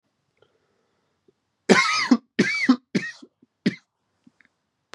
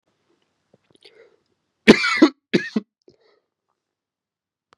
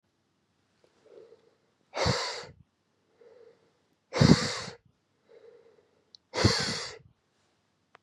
{"three_cough_length": "4.9 s", "three_cough_amplitude": 28451, "three_cough_signal_mean_std_ratio": 0.32, "cough_length": "4.8 s", "cough_amplitude": 32768, "cough_signal_mean_std_ratio": 0.21, "exhalation_length": "8.0 s", "exhalation_amplitude": 24045, "exhalation_signal_mean_std_ratio": 0.28, "survey_phase": "beta (2021-08-13 to 2022-03-07)", "age": "18-44", "gender": "Male", "wearing_mask": "No", "symptom_cough_any": true, "symptom_new_continuous_cough": true, "symptom_runny_or_blocked_nose": true, "symptom_shortness_of_breath": true, "symptom_sore_throat": true, "symptom_abdominal_pain": true, "symptom_fatigue": true, "symptom_headache": true, "symptom_change_to_sense_of_smell_or_taste": true, "symptom_onset": "3 days", "smoker_status": "Never smoked", "respiratory_condition_asthma": false, "respiratory_condition_other": false, "recruitment_source": "Test and Trace", "submission_delay": "2 days", "covid_test_result": "Positive", "covid_test_method": "RT-qPCR"}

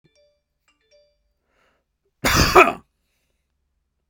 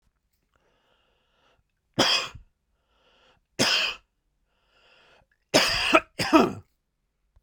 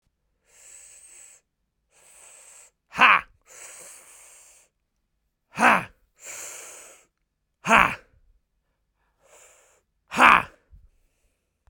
{"cough_length": "4.1 s", "cough_amplitude": 32768, "cough_signal_mean_std_ratio": 0.24, "three_cough_length": "7.4 s", "three_cough_amplitude": 27284, "three_cough_signal_mean_std_ratio": 0.33, "exhalation_length": "11.7 s", "exhalation_amplitude": 32767, "exhalation_signal_mean_std_ratio": 0.22, "survey_phase": "beta (2021-08-13 to 2022-03-07)", "age": "18-44", "gender": "Male", "wearing_mask": "Yes", "symptom_none": true, "smoker_status": "Never smoked", "respiratory_condition_asthma": false, "respiratory_condition_other": false, "recruitment_source": "REACT", "submission_delay": "1 day", "covid_test_result": "Negative", "covid_test_method": "RT-qPCR"}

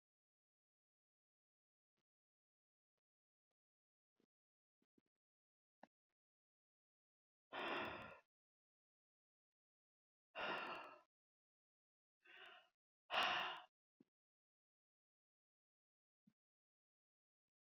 {"exhalation_length": "17.7 s", "exhalation_amplitude": 1277, "exhalation_signal_mean_std_ratio": 0.23, "survey_phase": "beta (2021-08-13 to 2022-03-07)", "age": "65+", "gender": "Female", "wearing_mask": "No", "symptom_runny_or_blocked_nose": true, "smoker_status": "Never smoked", "respiratory_condition_asthma": false, "respiratory_condition_other": false, "recruitment_source": "REACT", "submission_delay": "1 day", "covid_test_result": "Negative", "covid_test_method": "RT-qPCR"}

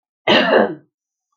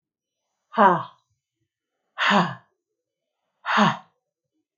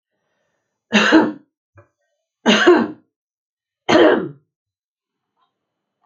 {"cough_length": "1.4 s", "cough_amplitude": 28120, "cough_signal_mean_std_ratio": 0.48, "exhalation_length": "4.8 s", "exhalation_amplitude": 24081, "exhalation_signal_mean_std_ratio": 0.32, "three_cough_length": "6.1 s", "three_cough_amplitude": 28356, "three_cough_signal_mean_std_ratio": 0.35, "survey_phase": "alpha (2021-03-01 to 2021-08-12)", "age": "45-64", "gender": "Female", "wearing_mask": "No", "symptom_none": true, "smoker_status": "Ex-smoker", "respiratory_condition_asthma": true, "respiratory_condition_other": false, "recruitment_source": "REACT", "submission_delay": "4 days", "covid_test_result": "Negative", "covid_test_method": "RT-qPCR"}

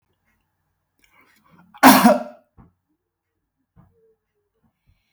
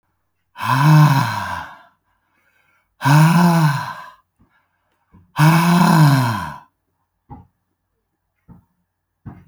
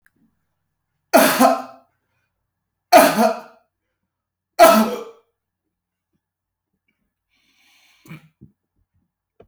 {"cough_length": "5.1 s", "cough_amplitude": 32768, "cough_signal_mean_std_ratio": 0.21, "exhalation_length": "9.5 s", "exhalation_amplitude": 28515, "exhalation_signal_mean_std_ratio": 0.48, "three_cough_length": "9.5 s", "three_cough_amplitude": 32768, "three_cough_signal_mean_std_ratio": 0.28, "survey_phase": "beta (2021-08-13 to 2022-03-07)", "age": "45-64", "gender": "Male", "wearing_mask": "No", "symptom_headache": true, "smoker_status": "Never smoked", "respiratory_condition_asthma": false, "respiratory_condition_other": false, "recruitment_source": "REACT", "submission_delay": "1 day", "covid_test_result": "Negative", "covid_test_method": "RT-qPCR"}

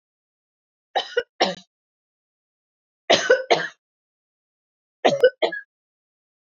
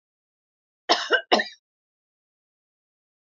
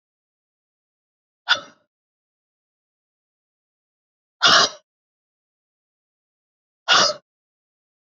{"three_cough_length": "6.6 s", "three_cough_amplitude": 27088, "three_cough_signal_mean_std_ratio": 0.29, "cough_length": "3.2 s", "cough_amplitude": 23383, "cough_signal_mean_std_ratio": 0.25, "exhalation_length": "8.2 s", "exhalation_amplitude": 27585, "exhalation_signal_mean_std_ratio": 0.21, "survey_phase": "beta (2021-08-13 to 2022-03-07)", "age": "45-64", "gender": "Female", "wearing_mask": "No", "symptom_none": true, "smoker_status": "Ex-smoker", "respiratory_condition_asthma": false, "respiratory_condition_other": false, "recruitment_source": "REACT", "submission_delay": "3 days", "covid_test_result": "Negative", "covid_test_method": "RT-qPCR", "influenza_a_test_result": "Negative", "influenza_b_test_result": "Negative"}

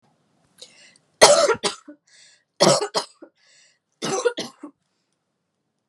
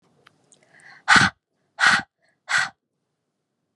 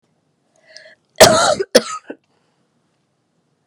{"three_cough_length": "5.9 s", "three_cough_amplitude": 32768, "three_cough_signal_mean_std_ratio": 0.31, "exhalation_length": "3.8 s", "exhalation_amplitude": 29594, "exhalation_signal_mean_std_ratio": 0.31, "cough_length": "3.7 s", "cough_amplitude": 32768, "cough_signal_mean_std_ratio": 0.28, "survey_phase": "beta (2021-08-13 to 2022-03-07)", "age": "18-44", "gender": "Female", "wearing_mask": "No", "symptom_new_continuous_cough": true, "symptom_sore_throat": true, "symptom_fatigue": true, "symptom_headache": true, "symptom_onset": "2 days", "smoker_status": "Never smoked", "respiratory_condition_asthma": false, "respiratory_condition_other": false, "recruitment_source": "Test and Trace", "submission_delay": "1 day", "covid_test_result": "Positive", "covid_test_method": "LAMP"}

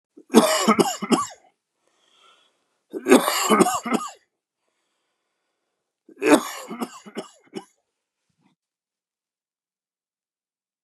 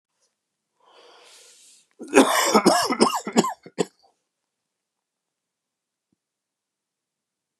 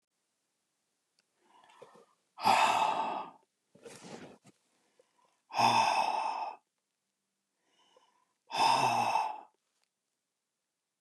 {"three_cough_length": "10.8 s", "three_cough_amplitude": 32677, "three_cough_signal_mean_std_ratio": 0.31, "cough_length": "7.6 s", "cough_amplitude": 32768, "cough_signal_mean_std_ratio": 0.3, "exhalation_length": "11.0 s", "exhalation_amplitude": 6543, "exhalation_signal_mean_std_ratio": 0.4, "survey_phase": "beta (2021-08-13 to 2022-03-07)", "age": "45-64", "gender": "Male", "wearing_mask": "No", "symptom_none": true, "symptom_onset": "9 days", "smoker_status": "Never smoked", "respiratory_condition_asthma": false, "respiratory_condition_other": true, "recruitment_source": "REACT", "submission_delay": "2 days", "covid_test_result": "Negative", "covid_test_method": "RT-qPCR", "influenza_a_test_result": "Negative", "influenza_b_test_result": "Negative"}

